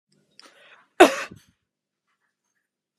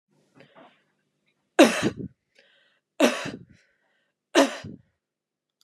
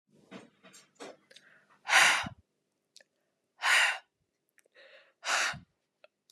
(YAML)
cough_length: 3.0 s
cough_amplitude: 32767
cough_signal_mean_std_ratio: 0.16
three_cough_length: 5.6 s
three_cough_amplitude: 27439
three_cough_signal_mean_std_ratio: 0.26
exhalation_length: 6.3 s
exhalation_amplitude: 13306
exhalation_signal_mean_std_ratio: 0.32
survey_phase: beta (2021-08-13 to 2022-03-07)
age: 18-44
gender: Female
wearing_mask: 'No'
symptom_runny_or_blocked_nose: true
symptom_headache: true
smoker_status: Never smoked
respiratory_condition_asthma: false
respiratory_condition_other: false
recruitment_source: REACT
submission_delay: 2 days
covid_test_result: Negative
covid_test_method: RT-qPCR